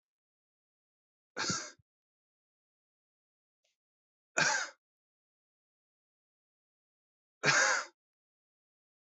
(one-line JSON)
{"three_cough_length": "9.0 s", "three_cough_amplitude": 8019, "three_cough_signal_mean_std_ratio": 0.25, "survey_phase": "beta (2021-08-13 to 2022-03-07)", "age": "18-44", "gender": "Male", "wearing_mask": "No", "symptom_cough_any": true, "symptom_runny_or_blocked_nose": true, "symptom_fatigue": true, "symptom_fever_high_temperature": true, "symptom_headache": true, "smoker_status": "Current smoker (1 to 10 cigarettes per day)", "respiratory_condition_asthma": false, "respiratory_condition_other": false, "recruitment_source": "Test and Trace", "submission_delay": "1 day", "covid_test_result": "Positive", "covid_test_method": "RT-qPCR", "covid_ct_value": 27.6, "covid_ct_gene": "ORF1ab gene", "covid_ct_mean": 28.2, "covid_viral_load": "550 copies/ml", "covid_viral_load_category": "Minimal viral load (< 10K copies/ml)"}